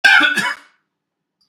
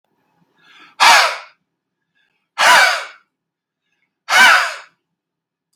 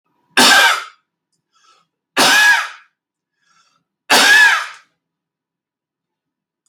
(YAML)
cough_length: 1.5 s
cough_amplitude: 32768
cough_signal_mean_std_ratio: 0.45
exhalation_length: 5.8 s
exhalation_amplitude: 32768
exhalation_signal_mean_std_ratio: 0.37
three_cough_length: 6.7 s
three_cough_amplitude: 32768
three_cough_signal_mean_std_ratio: 0.41
survey_phase: beta (2021-08-13 to 2022-03-07)
age: 45-64
gender: Male
wearing_mask: 'No'
symptom_none: true
smoker_status: Ex-smoker
respiratory_condition_asthma: false
respiratory_condition_other: false
recruitment_source: REACT
submission_delay: 1 day
covid_test_result: Negative
covid_test_method: RT-qPCR